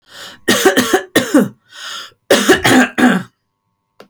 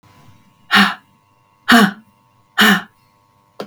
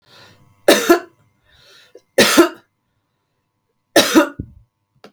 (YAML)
cough_length: 4.1 s
cough_amplitude: 32768
cough_signal_mean_std_ratio: 0.54
exhalation_length: 3.7 s
exhalation_amplitude: 32768
exhalation_signal_mean_std_ratio: 0.36
three_cough_length: 5.1 s
three_cough_amplitude: 32768
three_cough_signal_mean_std_ratio: 0.33
survey_phase: beta (2021-08-13 to 2022-03-07)
age: 45-64
gender: Female
wearing_mask: 'No'
symptom_none: true
symptom_onset: 7 days
smoker_status: Ex-smoker
respiratory_condition_asthma: false
respiratory_condition_other: false
recruitment_source: REACT
submission_delay: 4 days
covid_test_result: Positive
covid_test_method: RT-qPCR
covid_ct_value: 18.9
covid_ct_gene: E gene
influenza_a_test_result: Negative
influenza_b_test_result: Negative